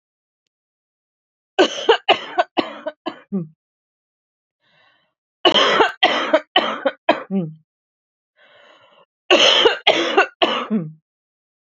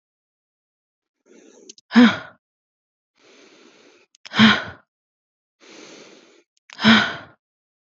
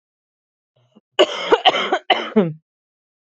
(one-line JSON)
{"three_cough_length": "11.6 s", "three_cough_amplitude": 29676, "three_cough_signal_mean_std_ratio": 0.41, "exhalation_length": "7.9 s", "exhalation_amplitude": 28197, "exhalation_signal_mean_std_ratio": 0.25, "cough_length": "3.3 s", "cough_amplitude": 32726, "cough_signal_mean_std_ratio": 0.38, "survey_phase": "beta (2021-08-13 to 2022-03-07)", "age": "18-44", "gender": "Female", "wearing_mask": "No", "symptom_none": true, "smoker_status": "Never smoked", "respiratory_condition_asthma": false, "respiratory_condition_other": false, "recruitment_source": "REACT", "submission_delay": "0 days", "covid_test_result": "Negative", "covid_test_method": "RT-qPCR", "influenza_a_test_result": "Negative", "influenza_b_test_result": "Negative"}